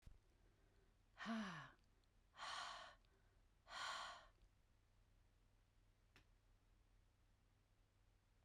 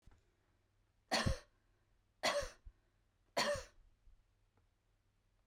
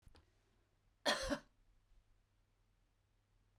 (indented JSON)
{
  "exhalation_length": "8.4 s",
  "exhalation_amplitude": 413,
  "exhalation_signal_mean_std_ratio": 0.45,
  "three_cough_length": "5.5 s",
  "three_cough_amplitude": 2630,
  "three_cough_signal_mean_std_ratio": 0.32,
  "cough_length": "3.6 s",
  "cough_amplitude": 2393,
  "cough_signal_mean_std_ratio": 0.25,
  "survey_phase": "beta (2021-08-13 to 2022-03-07)",
  "age": "45-64",
  "gender": "Female",
  "wearing_mask": "No",
  "symptom_none": true,
  "smoker_status": "Never smoked",
  "respiratory_condition_asthma": false,
  "respiratory_condition_other": false,
  "recruitment_source": "Test and Trace",
  "submission_delay": "0 days",
  "covid_test_result": "Negative",
  "covid_test_method": "LFT"
}